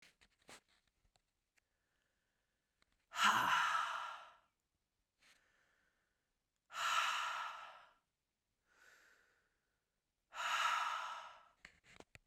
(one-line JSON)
{"exhalation_length": "12.3 s", "exhalation_amplitude": 3061, "exhalation_signal_mean_std_ratio": 0.38, "survey_phase": "beta (2021-08-13 to 2022-03-07)", "age": "18-44", "gender": "Female", "wearing_mask": "No", "symptom_cough_any": true, "symptom_new_continuous_cough": true, "symptom_runny_or_blocked_nose": true, "symptom_headache": true, "symptom_onset": "5 days", "smoker_status": "Never smoked", "respiratory_condition_asthma": false, "respiratory_condition_other": false, "recruitment_source": "REACT", "submission_delay": "2 days", "covid_test_result": "Negative", "covid_test_method": "RT-qPCR", "influenza_a_test_result": "Unknown/Void", "influenza_b_test_result": "Unknown/Void"}